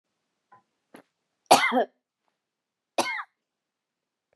{"cough_length": "4.4 s", "cough_amplitude": 25601, "cough_signal_mean_std_ratio": 0.24, "survey_phase": "beta (2021-08-13 to 2022-03-07)", "age": "45-64", "gender": "Female", "wearing_mask": "No", "symptom_runny_or_blocked_nose": true, "symptom_sore_throat": true, "symptom_abdominal_pain": true, "symptom_fatigue": true, "symptom_headache": true, "symptom_other": true, "symptom_onset": "2 days", "smoker_status": "Never smoked", "respiratory_condition_asthma": false, "respiratory_condition_other": false, "recruitment_source": "Test and Trace", "submission_delay": "1 day", "covid_test_result": "Positive", "covid_test_method": "RT-qPCR", "covid_ct_value": 20.8, "covid_ct_gene": "ORF1ab gene", "covid_ct_mean": 21.1, "covid_viral_load": "120000 copies/ml", "covid_viral_load_category": "Low viral load (10K-1M copies/ml)"}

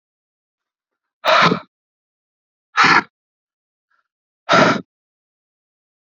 {"exhalation_length": "6.1 s", "exhalation_amplitude": 28401, "exhalation_signal_mean_std_ratio": 0.3, "survey_phase": "beta (2021-08-13 to 2022-03-07)", "age": "45-64", "gender": "Male", "wearing_mask": "No", "symptom_cough_any": true, "symptom_runny_or_blocked_nose": true, "symptom_sore_throat": true, "symptom_diarrhoea": true, "symptom_fatigue": true, "symptom_fever_high_temperature": true, "symptom_loss_of_taste": true, "symptom_onset": "4 days", "smoker_status": "Current smoker (e-cigarettes or vapes only)", "respiratory_condition_asthma": false, "respiratory_condition_other": false, "recruitment_source": "Test and Trace", "submission_delay": "1 day", "covid_test_result": "Positive", "covid_test_method": "RT-qPCR", "covid_ct_value": 14.3, "covid_ct_gene": "ORF1ab gene", "covid_ct_mean": 14.7, "covid_viral_load": "15000000 copies/ml", "covid_viral_load_category": "High viral load (>1M copies/ml)"}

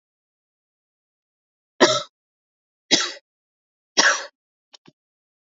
{"three_cough_length": "5.5 s", "three_cough_amplitude": 30347, "three_cough_signal_mean_std_ratio": 0.24, "survey_phase": "alpha (2021-03-01 to 2021-08-12)", "age": "18-44", "gender": "Male", "wearing_mask": "No", "symptom_none": true, "smoker_status": "Never smoked", "respiratory_condition_asthma": false, "respiratory_condition_other": false, "recruitment_source": "REACT", "submission_delay": "2 days", "covid_test_result": "Negative", "covid_test_method": "RT-qPCR"}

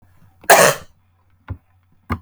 {"cough_length": "2.2 s", "cough_amplitude": 32768, "cough_signal_mean_std_ratio": 0.3, "survey_phase": "beta (2021-08-13 to 2022-03-07)", "age": "45-64", "gender": "Female", "wearing_mask": "No", "symptom_none": true, "smoker_status": "Never smoked", "respiratory_condition_asthma": false, "respiratory_condition_other": false, "recruitment_source": "REACT", "submission_delay": "3 days", "covid_test_result": "Negative", "covid_test_method": "RT-qPCR", "influenza_a_test_result": "Negative", "influenza_b_test_result": "Negative"}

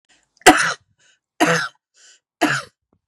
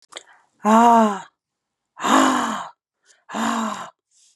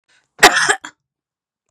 {"three_cough_length": "3.1 s", "three_cough_amplitude": 32768, "three_cough_signal_mean_std_ratio": 0.33, "exhalation_length": "4.4 s", "exhalation_amplitude": 26976, "exhalation_signal_mean_std_ratio": 0.47, "cough_length": "1.7 s", "cough_amplitude": 32768, "cough_signal_mean_std_ratio": 0.31, "survey_phase": "beta (2021-08-13 to 2022-03-07)", "age": "45-64", "gender": "Female", "wearing_mask": "No", "symptom_none": true, "smoker_status": "Never smoked", "respiratory_condition_asthma": false, "respiratory_condition_other": false, "recruitment_source": "REACT", "submission_delay": "1 day", "covid_test_result": "Negative", "covid_test_method": "RT-qPCR", "influenza_a_test_result": "Unknown/Void", "influenza_b_test_result": "Unknown/Void"}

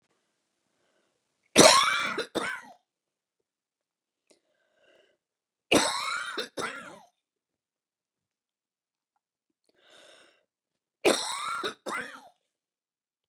{"three_cough_length": "13.3 s", "three_cough_amplitude": 26729, "three_cough_signal_mean_std_ratio": 0.26, "survey_phase": "beta (2021-08-13 to 2022-03-07)", "age": "45-64", "gender": "Female", "wearing_mask": "No", "symptom_runny_or_blocked_nose": true, "symptom_fatigue": true, "smoker_status": "Ex-smoker", "respiratory_condition_asthma": true, "respiratory_condition_other": false, "recruitment_source": "REACT", "submission_delay": "0 days", "covid_test_result": "Negative", "covid_test_method": "RT-qPCR"}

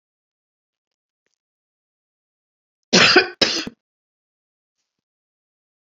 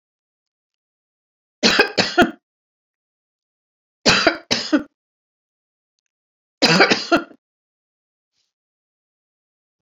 {"cough_length": "5.8 s", "cough_amplitude": 30864, "cough_signal_mean_std_ratio": 0.22, "three_cough_length": "9.8 s", "three_cough_amplitude": 32767, "three_cough_signal_mean_std_ratio": 0.29, "survey_phase": "beta (2021-08-13 to 2022-03-07)", "age": "65+", "gender": "Female", "wearing_mask": "No", "symptom_sore_throat": true, "symptom_headache": true, "smoker_status": "Never smoked", "respiratory_condition_asthma": false, "respiratory_condition_other": false, "recruitment_source": "REACT", "submission_delay": "1 day", "covid_test_result": "Negative", "covid_test_method": "RT-qPCR", "influenza_a_test_result": "Negative", "influenza_b_test_result": "Negative"}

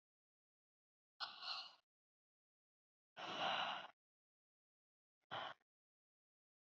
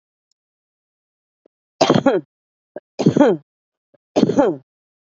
{"exhalation_length": "6.7 s", "exhalation_amplitude": 1133, "exhalation_signal_mean_std_ratio": 0.33, "three_cough_length": "5.0 s", "three_cough_amplitude": 32767, "three_cough_signal_mean_std_ratio": 0.34, "survey_phase": "beta (2021-08-13 to 2022-03-07)", "age": "18-44", "gender": "Female", "wearing_mask": "No", "symptom_cough_any": true, "symptom_sore_throat": true, "symptom_onset": "6 days", "smoker_status": "Ex-smoker", "respiratory_condition_asthma": true, "respiratory_condition_other": false, "recruitment_source": "REACT", "submission_delay": "12 days", "covid_test_result": "Negative", "covid_test_method": "RT-qPCR"}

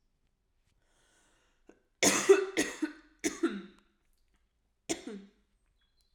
{"three_cough_length": "6.1 s", "three_cough_amplitude": 10455, "three_cough_signal_mean_std_ratio": 0.29, "survey_phase": "beta (2021-08-13 to 2022-03-07)", "age": "18-44", "gender": "Female", "wearing_mask": "No", "symptom_cough_any": true, "symptom_new_continuous_cough": true, "symptom_runny_or_blocked_nose": true, "symptom_shortness_of_breath": true, "symptom_fatigue": true, "smoker_status": "Ex-smoker", "respiratory_condition_asthma": false, "respiratory_condition_other": false, "recruitment_source": "Test and Trace", "submission_delay": "2 days", "covid_test_result": "Positive", "covid_test_method": "LFT"}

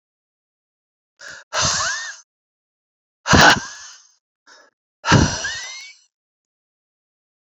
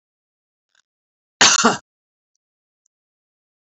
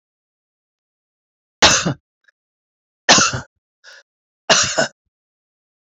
{"exhalation_length": "7.5 s", "exhalation_amplitude": 30478, "exhalation_signal_mean_std_ratio": 0.31, "cough_length": "3.8 s", "cough_amplitude": 32767, "cough_signal_mean_std_ratio": 0.22, "three_cough_length": "5.9 s", "three_cough_amplitude": 30806, "three_cough_signal_mean_std_ratio": 0.3, "survey_phase": "beta (2021-08-13 to 2022-03-07)", "age": "65+", "gender": "Female", "wearing_mask": "No", "symptom_none": true, "smoker_status": "Ex-smoker", "respiratory_condition_asthma": false, "respiratory_condition_other": false, "recruitment_source": "REACT", "submission_delay": "1 day", "covid_test_result": "Negative", "covid_test_method": "RT-qPCR", "influenza_a_test_result": "Negative", "influenza_b_test_result": "Negative"}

